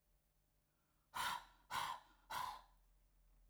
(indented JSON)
{
  "exhalation_length": "3.5 s",
  "exhalation_amplitude": 1031,
  "exhalation_signal_mean_std_ratio": 0.45,
  "survey_phase": "alpha (2021-03-01 to 2021-08-12)",
  "age": "45-64",
  "gender": "Female",
  "wearing_mask": "No",
  "symptom_none": true,
  "symptom_onset": "9 days",
  "smoker_status": "Ex-smoker",
  "respiratory_condition_asthma": false,
  "respiratory_condition_other": false,
  "recruitment_source": "REACT",
  "submission_delay": "2 days",
  "covid_test_result": "Negative",
  "covid_test_method": "RT-qPCR"
}